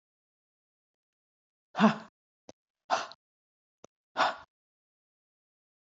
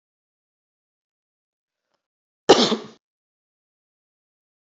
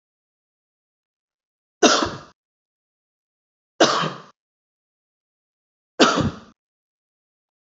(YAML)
exhalation_length: 5.8 s
exhalation_amplitude: 11451
exhalation_signal_mean_std_ratio: 0.21
cough_length: 4.7 s
cough_amplitude: 27516
cough_signal_mean_std_ratio: 0.17
three_cough_length: 7.7 s
three_cough_amplitude: 29382
three_cough_signal_mean_std_ratio: 0.25
survey_phase: beta (2021-08-13 to 2022-03-07)
age: 65+
gender: Female
wearing_mask: 'No'
symptom_none: true
smoker_status: Ex-smoker
respiratory_condition_asthma: false
respiratory_condition_other: false
recruitment_source: REACT
submission_delay: 1 day
covid_test_result: Negative
covid_test_method: RT-qPCR
influenza_a_test_result: Unknown/Void
influenza_b_test_result: Unknown/Void